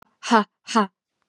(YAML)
exhalation_length: 1.3 s
exhalation_amplitude: 25892
exhalation_signal_mean_std_ratio: 0.36
survey_phase: beta (2021-08-13 to 2022-03-07)
age: 18-44
gender: Female
wearing_mask: 'No'
symptom_none: true
smoker_status: Never smoked
respiratory_condition_asthma: false
respiratory_condition_other: false
recruitment_source: REACT
submission_delay: 2 days
covid_test_result: Negative
covid_test_method: RT-qPCR